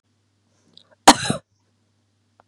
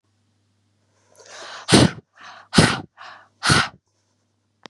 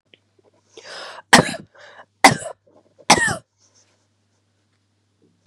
{
  "cough_length": "2.5 s",
  "cough_amplitude": 32768,
  "cough_signal_mean_std_ratio": 0.17,
  "exhalation_length": "4.7 s",
  "exhalation_amplitude": 32137,
  "exhalation_signal_mean_std_ratio": 0.31,
  "three_cough_length": "5.5 s",
  "three_cough_amplitude": 32768,
  "three_cough_signal_mean_std_ratio": 0.23,
  "survey_phase": "beta (2021-08-13 to 2022-03-07)",
  "age": "18-44",
  "gender": "Female",
  "wearing_mask": "No",
  "symptom_cough_any": true,
  "symptom_runny_or_blocked_nose": true,
  "symptom_sore_throat": true,
  "symptom_fatigue": true,
  "symptom_onset": "8 days",
  "smoker_status": "Ex-smoker",
  "respiratory_condition_asthma": false,
  "respiratory_condition_other": false,
  "recruitment_source": "Test and Trace",
  "submission_delay": "2 days",
  "covid_test_result": "Positive",
  "covid_test_method": "ePCR"
}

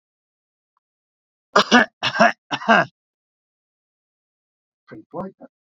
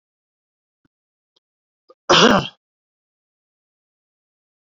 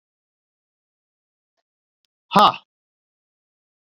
{
  "three_cough_length": "5.6 s",
  "three_cough_amplitude": 28504,
  "three_cough_signal_mean_std_ratio": 0.27,
  "cough_length": "4.6 s",
  "cough_amplitude": 31283,
  "cough_signal_mean_std_ratio": 0.21,
  "exhalation_length": "3.8 s",
  "exhalation_amplitude": 31984,
  "exhalation_signal_mean_std_ratio": 0.16,
  "survey_phase": "beta (2021-08-13 to 2022-03-07)",
  "age": "65+",
  "gender": "Male",
  "wearing_mask": "No",
  "symptom_cough_any": true,
  "symptom_runny_or_blocked_nose": true,
  "symptom_shortness_of_breath": true,
  "symptom_fatigue": true,
  "symptom_headache": true,
  "symptom_onset": "3 days",
  "smoker_status": "Current smoker (1 to 10 cigarettes per day)",
  "respiratory_condition_asthma": false,
  "respiratory_condition_other": false,
  "recruitment_source": "Test and Trace",
  "submission_delay": "2 days",
  "covid_test_result": "Positive",
  "covid_test_method": "RT-qPCR"
}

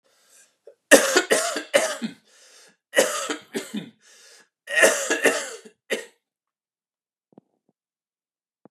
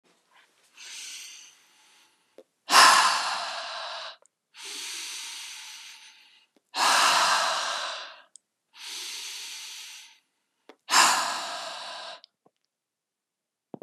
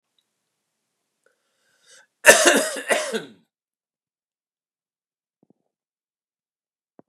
{
  "three_cough_length": "8.7 s",
  "three_cough_amplitude": 32768,
  "three_cough_signal_mean_std_ratio": 0.35,
  "exhalation_length": "13.8 s",
  "exhalation_amplitude": 26230,
  "exhalation_signal_mean_std_ratio": 0.4,
  "cough_length": "7.1 s",
  "cough_amplitude": 32768,
  "cough_signal_mean_std_ratio": 0.22,
  "survey_phase": "beta (2021-08-13 to 2022-03-07)",
  "age": "45-64",
  "gender": "Male",
  "wearing_mask": "No",
  "symptom_none": true,
  "smoker_status": "Ex-smoker",
  "respiratory_condition_asthma": false,
  "respiratory_condition_other": false,
  "recruitment_source": "REACT",
  "submission_delay": "2 days",
  "covid_test_result": "Negative",
  "covid_test_method": "RT-qPCR",
  "influenza_a_test_result": "Unknown/Void",
  "influenza_b_test_result": "Unknown/Void"
}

